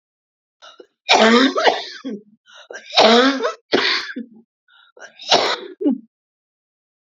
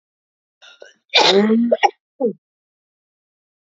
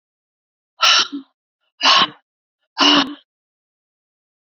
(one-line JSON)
{"three_cough_length": "7.1 s", "three_cough_amplitude": 31248, "three_cough_signal_mean_std_ratio": 0.45, "cough_length": "3.7 s", "cough_amplitude": 32431, "cough_signal_mean_std_ratio": 0.39, "exhalation_length": "4.4 s", "exhalation_amplitude": 31371, "exhalation_signal_mean_std_ratio": 0.35, "survey_phase": "beta (2021-08-13 to 2022-03-07)", "age": "45-64", "gender": "Female", "wearing_mask": "No", "symptom_cough_any": true, "symptom_shortness_of_breath": true, "smoker_status": "Never smoked", "respiratory_condition_asthma": true, "respiratory_condition_other": false, "recruitment_source": "REACT", "submission_delay": "1 day", "covid_test_result": "Negative", "covid_test_method": "RT-qPCR"}